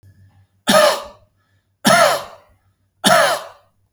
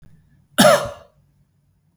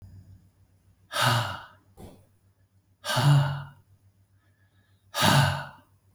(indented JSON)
{
  "three_cough_length": "3.9 s",
  "three_cough_amplitude": 32768,
  "three_cough_signal_mean_std_ratio": 0.43,
  "cough_length": "2.0 s",
  "cough_amplitude": 32768,
  "cough_signal_mean_std_ratio": 0.3,
  "exhalation_length": "6.1 s",
  "exhalation_amplitude": 14063,
  "exhalation_signal_mean_std_ratio": 0.41,
  "survey_phase": "alpha (2021-03-01 to 2021-08-12)",
  "age": "65+",
  "gender": "Male",
  "wearing_mask": "No",
  "symptom_none": true,
  "smoker_status": "Never smoked",
  "respiratory_condition_asthma": false,
  "respiratory_condition_other": false,
  "recruitment_source": "REACT",
  "submission_delay": "2 days",
  "covid_test_result": "Negative",
  "covid_test_method": "RT-qPCR"
}